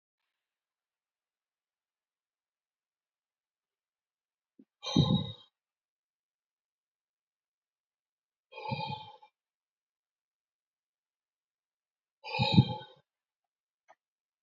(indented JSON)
{
  "exhalation_length": "14.4 s",
  "exhalation_amplitude": 12463,
  "exhalation_signal_mean_std_ratio": 0.19,
  "survey_phase": "beta (2021-08-13 to 2022-03-07)",
  "age": "45-64",
  "gender": "Male",
  "wearing_mask": "No",
  "symptom_none": true,
  "smoker_status": "Ex-smoker",
  "respiratory_condition_asthma": true,
  "respiratory_condition_other": true,
  "recruitment_source": "REACT",
  "submission_delay": "2 days",
  "covid_test_result": "Negative",
  "covid_test_method": "RT-qPCR",
  "influenza_a_test_result": "Negative",
  "influenza_b_test_result": "Negative"
}